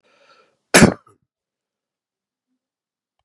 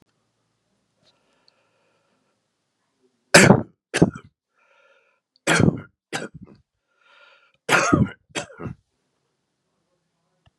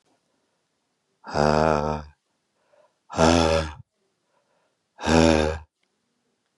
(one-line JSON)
{"cough_length": "3.2 s", "cough_amplitude": 32768, "cough_signal_mean_std_ratio": 0.17, "three_cough_length": "10.6 s", "three_cough_amplitude": 32768, "three_cough_signal_mean_std_ratio": 0.24, "exhalation_length": "6.6 s", "exhalation_amplitude": 23107, "exhalation_signal_mean_std_ratio": 0.36, "survey_phase": "beta (2021-08-13 to 2022-03-07)", "age": "65+", "gender": "Male", "wearing_mask": "No", "symptom_none": true, "smoker_status": "Never smoked", "respiratory_condition_asthma": false, "respiratory_condition_other": false, "recruitment_source": "REACT", "submission_delay": "1 day", "covid_test_result": "Negative", "covid_test_method": "RT-qPCR"}